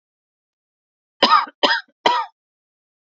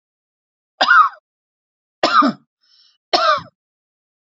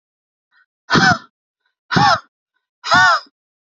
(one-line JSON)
{"cough_length": "3.2 s", "cough_amplitude": 27894, "cough_signal_mean_std_ratio": 0.33, "three_cough_length": "4.3 s", "three_cough_amplitude": 29574, "three_cough_signal_mean_std_ratio": 0.35, "exhalation_length": "3.8 s", "exhalation_amplitude": 31524, "exhalation_signal_mean_std_ratio": 0.4, "survey_phase": "beta (2021-08-13 to 2022-03-07)", "age": "18-44", "gender": "Female", "wearing_mask": "No", "symptom_sore_throat": true, "symptom_headache": true, "smoker_status": "Ex-smoker", "respiratory_condition_asthma": true, "respiratory_condition_other": false, "recruitment_source": "REACT", "submission_delay": "14 days", "covid_test_result": "Negative", "covid_test_method": "RT-qPCR"}